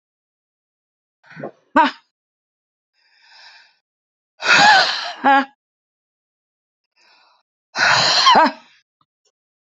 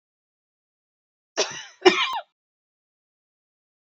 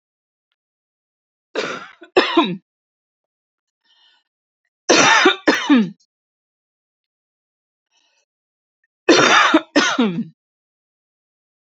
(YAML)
exhalation_length: 9.7 s
exhalation_amplitude: 32767
exhalation_signal_mean_std_ratio: 0.34
cough_length: 3.8 s
cough_amplitude: 29277
cough_signal_mean_std_ratio: 0.23
three_cough_length: 11.7 s
three_cough_amplitude: 32597
three_cough_signal_mean_std_ratio: 0.35
survey_phase: beta (2021-08-13 to 2022-03-07)
age: 45-64
gender: Female
wearing_mask: 'No'
symptom_fatigue: true
symptom_onset: 4 days
smoker_status: Never smoked
respiratory_condition_asthma: true
respiratory_condition_other: false
recruitment_source: REACT
submission_delay: -2 days
covid_test_result: Negative
covid_test_method: RT-qPCR
influenza_a_test_result: Unknown/Void
influenza_b_test_result: Unknown/Void